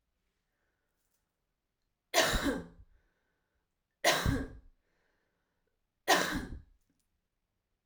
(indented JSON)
{
  "three_cough_length": "7.9 s",
  "three_cough_amplitude": 8323,
  "three_cough_signal_mean_std_ratio": 0.31,
  "survey_phase": "alpha (2021-03-01 to 2021-08-12)",
  "age": "18-44",
  "gender": "Female",
  "wearing_mask": "No",
  "symptom_cough_any": true,
  "symptom_shortness_of_breath": true,
  "symptom_fatigue": true,
  "symptom_fever_high_temperature": true,
  "symptom_headache": true,
  "smoker_status": "Never smoked",
  "respiratory_condition_asthma": false,
  "respiratory_condition_other": false,
  "recruitment_source": "Test and Trace",
  "submission_delay": "2 days",
  "covid_test_result": "Positive",
  "covid_test_method": "LFT"
}